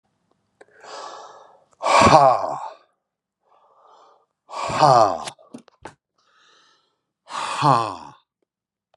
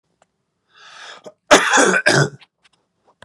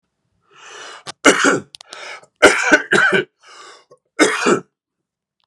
{
  "exhalation_length": "9.0 s",
  "exhalation_amplitude": 32706,
  "exhalation_signal_mean_std_ratio": 0.34,
  "cough_length": "3.2 s",
  "cough_amplitude": 32768,
  "cough_signal_mean_std_ratio": 0.38,
  "three_cough_length": "5.5 s",
  "three_cough_amplitude": 32768,
  "three_cough_signal_mean_std_ratio": 0.41,
  "survey_phase": "beta (2021-08-13 to 2022-03-07)",
  "age": "45-64",
  "gender": "Male",
  "wearing_mask": "No",
  "symptom_none": true,
  "symptom_onset": "11 days",
  "smoker_status": "Ex-smoker",
  "respiratory_condition_asthma": false,
  "respiratory_condition_other": false,
  "recruitment_source": "REACT",
  "submission_delay": "0 days",
  "covid_test_result": "Negative",
  "covid_test_method": "RT-qPCR"
}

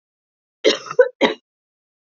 {
  "three_cough_length": "2.0 s",
  "three_cough_amplitude": 27245,
  "three_cough_signal_mean_std_ratio": 0.3,
  "survey_phase": "beta (2021-08-13 to 2022-03-07)",
  "age": "18-44",
  "gender": "Female",
  "wearing_mask": "No",
  "symptom_runny_or_blocked_nose": true,
  "symptom_fatigue": true,
  "smoker_status": "Never smoked",
  "respiratory_condition_asthma": false,
  "respiratory_condition_other": false,
  "recruitment_source": "REACT",
  "submission_delay": "0 days",
  "covid_test_result": "Negative",
  "covid_test_method": "RT-qPCR",
  "influenza_a_test_result": "Negative",
  "influenza_b_test_result": "Negative"
}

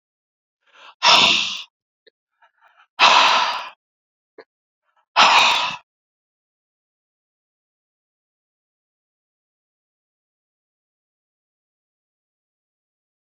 {
  "exhalation_length": "13.3 s",
  "exhalation_amplitude": 31488,
  "exhalation_signal_mean_std_ratio": 0.27,
  "survey_phase": "alpha (2021-03-01 to 2021-08-12)",
  "age": "18-44",
  "gender": "Male",
  "wearing_mask": "No",
  "symptom_cough_any": true,
  "symptom_fatigue": true,
  "symptom_fever_high_temperature": true,
  "symptom_headache": true,
  "smoker_status": "Never smoked",
  "respiratory_condition_asthma": false,
  "respiratory_condition_other": false,
  "recruitment_source": "Test and Trace",
  "submission_delay": "1 day",
  "covid_test_result": "Positive",
  "covid_test_method": "RT-qPCR",
  "covid_ct_value": 14.8,
  "covid_ct_gene": "ORF1ab gene",
  "covid_ct_mean": 16.3,
  "covid_viral_load": "4500000 copies/ml",
  "covid_viral_load_category": "High viral load (>1M copies/ml)"
}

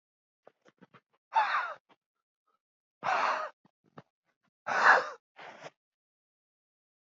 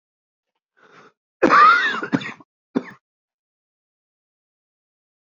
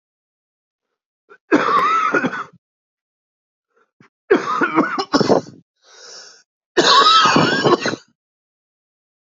{
  "exhalation_length": "7.2 s",
  "exhalation_amplitude": 14086,
  "exhalation_signal_mean_std_ratio": 0.3,
  "cough_length": "5.2 s",
  "cough_amplitude": 27435,
  "cough_signal_mean_std_ratio": 0.29,
  "three_cough_length": "9.3 s",
  "three_cough_amplitude": 32043,
  "three_cough_signal_mean_std_ratio": 0.46,
  "survey_phase": "beta (2021-08-13 to 2022-03-07)",
  "age": "18-44",
  "gender": "Male",
  "wearing_mask": "No",
  "symptom_cough_any": true,
  "symptom_new_continuous_cough": true,
  "symptom_sore_throat": true,
  "symptom_fatigue": true,
  "symptom_fever_high_temperature": true,
  "symptom_headache": true,
  "symptom_change_to_sense_of_smell_or_taste": true,
  "symptom_onset": "5 days",
  "smoker_status": "Ex-smoker",
  "respiratory_condition_asthma": false,
  "respiratory_condition_other": false,
  "recruitment_source": "Test and Trace",
  "submission_delay": "1 day",
  "covid_test_result": "Positive",
  "covid_test_method": "RT-qPCR",
  "covid_ct_value": 21.6,
  "covid_ct_gene": "ORF1ab gene",
  "covid_ct_mean": 22.0,
  "covid_viral_load": "61000 copies/ml",
  "covid_viral_load_category": "Low viral load (10K-1M copies/ml)"
}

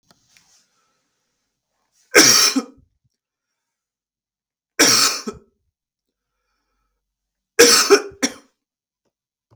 {
  "three_cough_length": "9.6 s",
  "three_cough_amplitude": 32768,
  "three_cough_signal_mean_std_ratio": 0.29,
  "survey_phase": "beta (2021-08-13 to 2022-03-07)",
  "age": "18-44",
  "gender": "Male",
  "wearing_mask": "No",
  "symptom_cough_any": true,
  "symptom_runny_or_blocked_nose": true,
  "symptom_sore_throat": true,
  "symptom_fatigue": true,
  "symptom_onset": "2 days",
  "smoker_status": "Never smoked",
  "respiratory_condition_asthma": false,
  "respiratory_condition_other": false,
  "recruitment_source": "Test and Trace",
  "submission_delay": "1 day",
  "covid_test_result": "Positive",
  "covid_test_method": "RT-qPCR",
  "covid_ct_value": 31.6,
  "covid_ct_gene": "N gene"
}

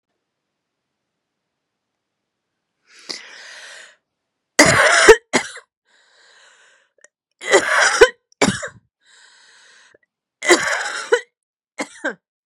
{
  "three_cough_length": "12.5 s",
  "three_cough_amplitude": 32768,
  "three_cough_signal_mean_std_ratio": 0.3,
  "survey_phase": "beta (2021-08-13 to 2022-03-07)",
  "age": "45-64",
  "gender": "Female",
  "wearing_mask": "No",
  "symptom_cough_any": true,
  "symptom_new_continuous_cough": true,
  "symptom_runny_or_blocked_nose": true,
  "symptom_shortness_of_breath": true,
  "symptom_sore_throat": true,
  "symptom_fatigue": true,
  "symptom_headache": true,
  "symptom_change_to_sense_of_smell_or_taste": true,
  "symptom_onset": "3 days",
  "smoker_status": "Never smoked",
  "respiratory_condition_asthma": false,
  "respiratory_condition_other": false,
  "recruitment_source": "Test and Trace",
  "submission_delay": "1 day",
  "covid_test_result": "Positive",
  "covid_test_method": "RT-qPCR",
  "covid_ct_value": 27.0,
  "covid_ct_gene": "N gene"
}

